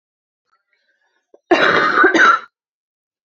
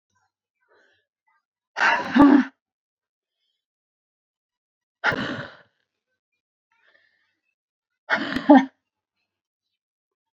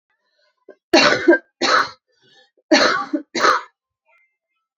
cough_length: 3.2 s
cough_amplitude: 28674
cough_signal_mean_std_ratio: 0.44
exhalation_length: 10.3 s
exhalation_amplitude: 27338
exhalation_signal_mean_std_ratio: 0.24
three_cough_length: 4.8 s
three_cough_amplitude: 31172
three_cough_signal_mean_std_ratio: 0.41
survey_phase: beta (2021-08-13 to 2022-03-07)
age: 18-44
gender: Female
wearing_mask: 'No'
symptom_cough_any: true
symptom_new_continuous_cough: true
symptom_runny_or_blocked_nose: true
symptom_shortness_of_breath: true
symptom_fatigue: true
symptom_headache: true
symptom_change_to_sense_of_smell_or_taste: true
smoker_status: Never smoked
respiratory_condition_asthma: false
respiratory_condition_other: false
recruitment_source: Test and Trace
submission_delay: -1 day
covid_test_result: Negative
covid_test_method: LFT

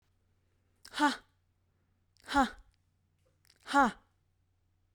exhalation_length: 4.9 s
exhalation_amplitude: 7395
exhalation_signal_mean_std_ratio: 0.25
survey_phase: beta (2021-08-13 to 2022-03-07)
age: 18-44
gender: Female
wearing_mask: 'No'
symptom_none: true
smoker_status: Never smoked
respiratory_condition_asthma: false
respiratory_condition_other: false
recruitment_source: REACT
submission_delay: 1 day
covid_test_result: Negative
covid_test_method: RT-qPCR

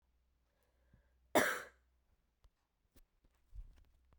cough_length: 4.2 s
cough_amplitude: 5904
cough_signal_mean_std_ratio: 0.21
survey_phase: beta (2021-08-13 to 2022-03-07)
age: 18-44
gender: Female
wearing_mask: 'No'
symptom_cough_any: true
symptom_new_continuous_cough: true
symptom_runny_or_blocked_nose: true
symptom_shortness_of_breath: true
symptom_sore_throat: true
symptom_abdominal_pain: true
symptom_diarrhoea: true
symptom_fever_high_temperature: true
symptom_headache: true
symptom_change_to_sense_of_smell_or_taste: true
symptom_loss_of_taste: true
symptom_onset: 3 days
smoker_status: Never smoked
respiratory_condition_asthma: false
respiratory_condition_other: false
recruitment_source: Test and Trace
submission_delay: 2 days
covid_test_result: Positive
covid_test_method: RT-qPCR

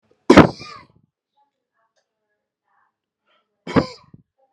cough_length: 4.5 s
cough_amplitude: 32768
cough_signal_mean_std_ratio: 0.19
survey_phase: beta (2021-08-13 to 2022-03-07)
age: 18-44
gender: Male
wearing_mask: 'No'
symptom_cough_any: true
symptom_fatigue: true
symptom_headache: true
symptom_onset: 4 days
smoker_status: Never smoked
respiratory_condition_asthma: false
respiratory_condition_other: false
recruitment_source: REACT
submission_delay: 1 day
covid_test_result: Negative
covid_test_method: RT-qPCR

